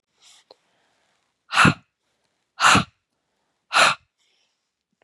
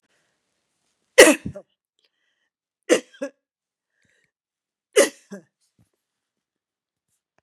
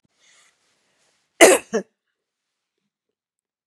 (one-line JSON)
{"exhalation_length": "5.0 s", "exhalation_amplitude": 26197, "exhalation_signal_mean_std_ratio": 0.28, "three_cough_length": "7.4 s", "three_cough_amplitude": 32768, "three_cough_signal_mean_std_ratio": 0.17, "cough_length": "3.7 s", "cough_amplitude": 32768, "cough_signal_mean_std_ratio": 0.19, "survey_phase": "beta (2021-08-13 to 2022-03-07)", "age": "65+", "gender": "Female", "wearing_mask": "No", "symptom_none": true, "symptom_onset": "4 days", "smoker_status": "Ex-smoker", "respiratory_condition_asthma": false, "respiratory_condition_other": false, "recruitment_source": "REACT", "submission_delay": "2 days", "covid_test_result": "Negative", "covid_test_method": "RT-qPCR", "influenza_a_test_result": "Negative", "influenza_b_test_result": "Negative"}